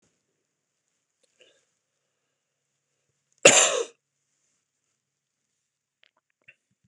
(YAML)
cough_length: 6.9 s
cough_amplitude: 26028
cough_signal_mean_std_ratio: 0.16
survey_phase: beta (2021-08-13 to 2022-03-07)
age: 45-64
gender: Male
wearing_mask: 'No'
symptom_cough_any: true
symptom_shortness_of_breath: true
symptom_diarrhoea: true
symptom_fatigue: true
symptom_headache: true
symptom_onset: 5 days
smoker_status: Never smoked
respiratory_condition_asthma: false
respiratory_condition_other: false
recruitment_source: Test and Trace
submission_delay: 2 days
covid_test_result: Positive
covid_test_method: RT-qPCR
covid_ct_value: 29.6
covid_ct_gene: ORF1ab gene